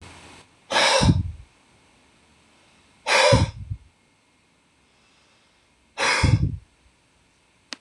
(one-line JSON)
{"exhalation_length": "7.8 s", "exhalation_amplitude": 23646, "exhalation_signal_mean_std_ratio": 0.38, "survey_phase": "beta (2021-08-13 to 2022-03-07)", "age": "45-64", "gender": "Male", "wearing_mask": "No", "symptom_none": true, "smoker_status": "Never smoked", "respiratory_condition_asthma": false, "respiratory_condition_other": false, "recruitment_source": "REACT", "submission_delay": "1 day", "covid_test_result": "Negative", "covid_test_method": "RT-qPCR", "influenza_a_test_result": "Negative", "influenza_b_test_result": "Negative"}